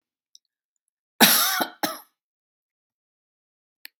{"cough_length": "4.0 s", "cough_amplitude": 32228, "cough_signal_mean_std_ratio": 0.26, "survey_phase": "beta (2021-08-13 to 2022-03-07)", "age": "65+", "gender": "Female", "wearing_mask": "No", "symptom_none": true, "smoker_status": "Ex-smoker", "respiratory_condition_asthma": false, "respiratory_condition_other": false, "recruitment_source": "REACT", "submission_delay": "1 day", "covid_test_result": "Negative", "covid_test_method": "RT-qPCR", "influenza_a_test_result": "Negative", "influenza_b_test_result": "Negative"}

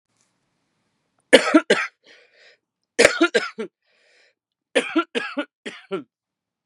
{"three_cough_length": "6.7 s", "three_cough_amplitude": 32768, "three_cough_signal_mean_std_ratio": 0.29, "survey_phase": "beta (2021-08-13 to 2022-03-07)", "age": "45-64", "gender": "Female", "wearing_mask": "No", "symptom_cough_any": true, "symptom_runny_or_blocked_nose": true, "symptom_shortness_of_breath": true, "symptom_sore_throat": true, "symptom_abdominal_pain": true, "symptom_diarrhoea": true, "symptom_fatigue": true, "symptom_fever_high_temperature": true, "symptom_headache": true, "symptom_change_to_sense_of_smell_or_taste": true, "symptom_loss_of_taste": true, "smoker_status": "Current smoker (1 to 10 cigarettes per day)", "respiratory_condition_asthma": false, "respiratory_condition_other": false, "recruitment_source": "Test and Trace", "submission_delay": "2 days", "covid_test_result": "Positive", "covid_test_method": "LFT"}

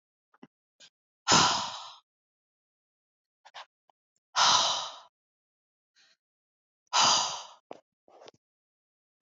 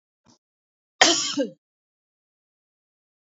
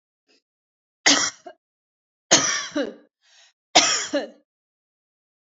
{"exhalation_length": "9.2 s", "exhalation_amplitude": 13016, "exhalation_signal_mean_std_ratio": 0.3, "cough_length": "3.2 s", "cough_amplitude": 28845, "cough_signal_mean_std_ratio": 0.25, "three_cough_length": "5.5 s", "three_cough_amplitude": 28831, "three_cough_signal_mean_std_ratio": 0.33, "survey_phase": "beta (2021-08-13 to 2022-03-07)", "age": "45-64", "gender": "Female", "wearing_mask": "No", "symptom_none": true, "smoker_status": "Ex-smoker", "respiratory_condition_asthma": true, "respiratory_condition_other": false, "recruitment_source": "REACT", "submission_delay": "1 day", "covid_test_result": "Negative", "covid_test_method": "RT-qPCR"}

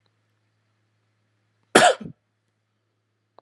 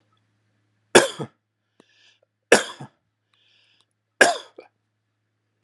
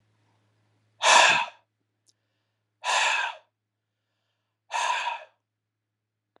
{"cough_length": "3.4 s", "cough_amplitude": 32767, "cough_signal_mean_std_ratio": 0.19, "three_cough_length": "5.6 s", "three_cough_amplitude": 32768, "three_cough_signal_mean_std_ratio": 0.19, "exhalation_length": "6.4 s", "exhalation_amplitude": 20360, "exhalation_signal_mean_std_ratio": 0.34, "survey_phase": "beta (2021-08-13 to 2022-03-07)", "age": "45-64", "gender": "Male", "wearing_mask": "No", "symptom_none": true, "smoker_status": "Never smoked", "respiratory_condition_asthma": true, "respiratory_condition_other": false, "recruitment_source": "REACT", "submission_delay": "1 day", "covid_test_result": "Negative", "covid_test_method": "RT-qPCR", "influenza_a_test_result": "Negative", "influenza_b_test_result": "Negative"}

